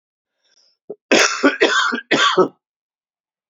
{"cough_length": "3.5 s", "cough_amplitude": 31977, "cough_signal_mean_std_ratio": 0.45, "survey_phase": "beta (2021-08-13 to 2022-03-07)", "age": "65+", "gender": "Male", "wearing_mask": "No", "symptom_cough_any": true, "symptom_runny_or_blocked_nose": true, "symptom_shortness_of_breath": true, "symptom_sore_throat": true, "symptom_change_to_sense_of_smell_or_taste": true, "symptom_loss_of_taste": true, "symptom_onset": "4 days", "smoker_status": "Ex-smoker", "respiratory_condition_asthma": false, "respiratory_condition_other": false, "recruitment_source": "Test and Trace", "submission_delay": "2 days", "covid_test_result": "Positive", "covid_test_method": "RT-qPCR", "covid_ct_value": 20.1, "covid_ct_gene": "ORF1ab gene"}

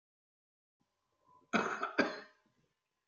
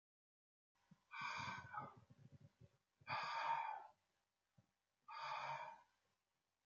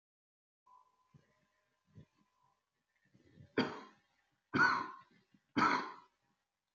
{"cough_length": "3.1 s", "cough_amplitude": 5310, "cough_signal_mean_std_ratio": 0.31, "exhalation_length": "6.7 s", "exhalation_amplitude": 937, "exhalation_signal_mean_std_ratio": 0.49, "three_cough_length": "6.7 s", "three_cough_amplitude": 3978, "three_cough_signal_mean_std_ratio": 0.28, "survey_phase": "beta (2021-08-13 to 2022-03-07)", "age": "65+", "gender": "Male", "wearing_mask": "No", "symptom_cough_any": true, "symptom_sore_throat": true, "symptom_onset": "4 days", "smoker_status": "Ex-smoker", "respiratory_condition_asthma": false, "respiratory_condition_other": false, "recruitment_source": "Test and Trace", "submission_delay": "2 days", "covid_test_result": "Positive", "covid_test_method": "ePCR"}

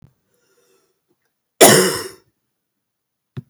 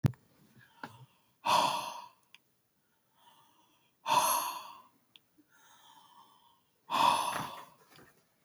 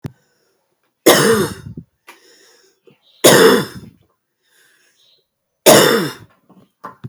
{"cough_length": "3.5 s", "cough_amplitude": 32768, "cough_signal_mean_std_ratio": 0.25, "exhalation_length": "8.4 s", "exhalation_amplitude": 7144, "exhalation_signal_mean_std_ratio": 0.36, "three_cough_length": "7.1 s", "three_cough_amplitude": 32768, "three_cough_signal_mean_std_ratio": 0.35, "survey_phase": "beta (2021-08-13 to 2022-03-07)", "age": "45-64", "gender": "Female", "wearing_mask": "No", "symptom_cough_any": true, "symptom_runny_or_blocked_nose": true, "symptom_headache": true, "symptom_change_to_sense_of_smell_or_taste": true, "symptom_loss_of_taste": true, "symptom_onset": "4 days", "smoker_status": "Never smoked", "respiratory_condition_asthma": false, "respiratory_condition_other": false, "recruitment_source": "Test and Trace", "submission_delay": "2 days", "covid_test_result": "Positive", "covid_test_method": "RT-qPCR", "covid_ct_value": 14.5, "covid_ct_gene": "ORF1ab gene", "covid_ct_mean": 14.9, "covid_viral_load": "13000000 copies/ml", "covid_viral_load_category": "High viral load (>1M copies/ml)"}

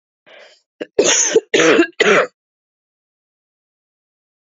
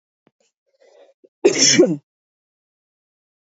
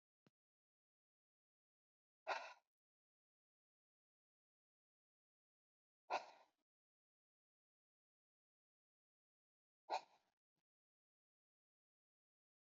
{"three_cough_length": "4.4 s", "three_cough_amplitude": 31246, "three_cough_signal_mean_std_ratio": 0.39, "cough_length": "3.6 s", "cough_amplitude": 28878, "cough_signal_mean_std_ratio": 0.28, "exhalation_length": "12.7 s", "exhalation_amplitude": 954, "exhalation_signal_mean_std_ratio": 0.14, "survey_phase": "beta (2021-08-13 to 2022-03-07)", "age": "18-44", "gender": "Female", "wearing_mask": "Yes", "symptom_cough_any": true, "symptom_runny_or_blocked_nose": true, "symptom_sore_throat": true, "symptom_fatigue": true, "symptom_headache": true, "smoker_status": "Current smoker (11 or more cigarettes per day)", "respiratory_condition_asthma": false, "respiratory_condition_other": false, "recruitment_source": "Test and Trace", "submission_delay": "1 day", "covid_test_result": "Positive", "covid_test_method": "RT-qPCR", "covid_ct_value": 26.4, "covid_ct_gene": "ORF1ab gene", "covid_ct_mean": 27.0, "covid_viral_load": "1400 copies/ml", "covid_viral_load_category": "Minimal viral load (< 10K copies/ml)"}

